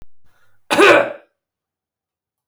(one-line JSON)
{"cough_length": "2.5 s", "cough_amplitude": 30347, "cough_signal_mean_std_ratio": 0.33, "survey_phase": "beta (2021-08-13 to 2022-03-07)", "age": "45-64", "gender": "Female", "wearing_mask": "No", "symptom_cough_any": true, "symptom_runny_or_blocked_nose": true, "symptom_sore_throat": true, "symptom_fatigue": true, "symptom_headache": true, "symptom_change_to_sense_of_smell_or_taste": true, "symptom_loss_of_taste": true, "symptom_onset": "6 days", "smoker_status": "Ex-smoker", "respiratory_condition_asthma": false, "respiratory_condition_other": false, "recruitment_source": "Test and Trace", "submission_delay": "1 day", "covid_test_result": "Positive", "covid_test_method": "RT-qPCR", "covid_ct_value": 23.1, "covid_ct_gene": "ORF1ab gene"}